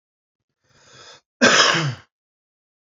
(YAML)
cough_length: 2.9 s
cough_amplitude: 27781
cough_signal_mean_std_ratio: 0.34
survey_phase: beta (2021-08-13 to 2022-03-07)
age: 18-44
gender: Male
wearing_mask: 'No'
symptom_cough_any: true
symptom_runny_or_blocked_nose: true
smoker_status: Ex-smoker
respiratory_condition_asthma: true
respiratory_condition_other: false
recruitment_source: Test and Trace
submission_delay: 3 days
covid_test_result: Negative
covid_test_method: RT-qPCR